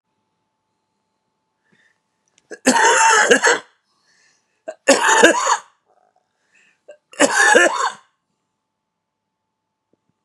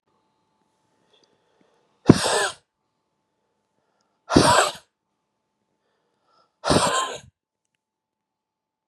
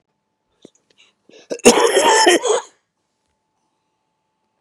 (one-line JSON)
{"three_cough_length": "10.2 s", "three_cough_amplitude": 32768, "three_cough_signal_mean_std_ratio": 0.38, "exhalation_length": "8.9 s", "exhalation_amplitude": 32768, "exhalation_signal_mean_std_ratio": 0.26, "cough_length": "4.6 s", "cough_amplitude": 32768, "cough_signal_mean_std_ratio": 0.36, "survey_phase": "beta (2021-08-13 to 2022-03-07)", "age": "45-64", "gender": "Male", "wearing_mask": "No", "symptom_cough_any": true, "symptom_new_continuous_cough": true, "symptom_shortness_of_breath": true, "symptom_sore_throat": true, "symptom_fatigue": true, "symptom_fever_high_temperature": true, "symptom_headache": true, "symptom_change_to_sense_of_smell_or_taste": true, "symptom_onset": "4 days", "smoker_status": "Never smoked", "respiratory_condition_asthma": false, "respiratory_condition_other": false, "recruitment_source": "Test and Trace", "submission_delay": "2 days", "covid_test_result": "Positive", "covid_test_method": "ePCR"}